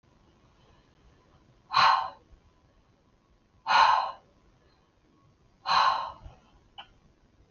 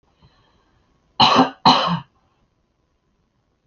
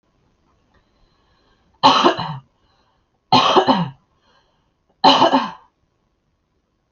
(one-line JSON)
{"exhalation_length": "7.5 s", "exhalation_amplitude": 11536, "exhalation_signal_mean_std_ratio": 0.33, "cough_length": "3.7 s", "cough_amplitude": 32767, "cough_signal_mean_std_ratio": 0.32, "three_cough_length": "6.9 s", "three_cough_amplitude": 31737, "three_cough_signal_mean_std_ratio": 0.35, "survey_phase": "alpha (2021-03-01 to 2021-08-12)", "age": "18-44", "gender": "Female", "wearing_mask": "No", "symptom_none": true, "smoker_status": "Never smoked", "respiratory_condition_asthma": false, "respiratory_condition_other": false, "recruitment_source": "REACT", "submission_delay": "3 days", "covid_test_result": "Negative", "covid_test_method": "RT-qPCR"}